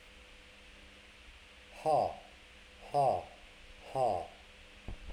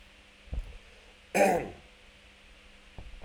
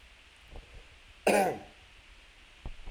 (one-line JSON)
{"exhalation_length": "5.1 s", "exhalation_amplitude": 3904, "exhalation_signal_mean_std_ratio": 0.45, "three_cough_length": "3.2 s", "three_cough_amplitude": 9272, "three_cough_signal_mean_std_ratio": 0.36, "cough_length": "2.9 s", "cough_amplitude": 7820, "cough_signal_mean_std_ratio": 0.36, "survey_phase": "alpha (2021-03-01 to 2021-08-12)", "age": "45-64", "gender": "Male", "wearing_mask": "No", "symptom_none": true, "smoker_status": "Current smoker (1 to 10 cigarettes per day)", "respiratory_condition_asthma": false, "respiratory_condition_other": false, "recruitment_source": "REACT", "submission_delay": "2 days", "covid_test_result": "Negative", "covid_test_method": "RT-qPCR"}